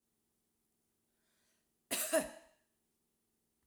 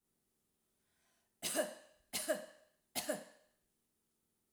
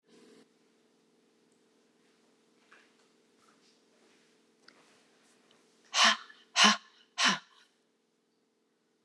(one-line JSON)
{"cough_length": "3.7 s", "cough_amplitude": 3603, "cough_signal_mean_std_ratio": 0.24, "three_cough_length": "4.5 s", "three_cough_amplitude": 2323, "three_cough_signal_mean_std_ratio": 0.34, "exhalation_length": "9.0 s", "exhalation_amplitude": 12616, "exhalation_signal_mean_std_ratio": 0.21, "survey_phase": "alpha (2021-03-01 to 2021-08-12)", "age": "45-64", "gender": "Female", "wearing_mask": "No", "symptom_none": true, "smoker_status": "Never smoked", "respiratory_condition_asthma": false, "respiratory_condition_other": false, "recruitment_source": "REACT", "submission_delay": "1 day", "covid_test_result": "Negative", "covid_test_method": "RT-qPCR"}